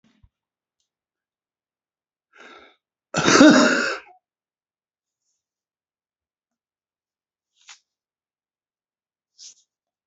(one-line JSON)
{"cough_length": "10.1 s", "cough_amplitude": 32767, "cough_signal_mean_std_ratio": 0.21, "survey_phase": "beta (2021-08-13 to 2022-03-07)", "age": "65+", "gender": "Male", "wearing_mask": "No", "symptom_cough_any": true, "smoker_status": "Never smoked", "respiratory_condition_asthma": true, "respiratory_condition_other": false, "recruitment_source": "REACT", "submission_delay": "7 days", "covid_test_result": "Negative", "covid_test_method": "RT-qPCR", "influenza_a_test_result": "Negative", "influenza_b_test_result": "Negative"}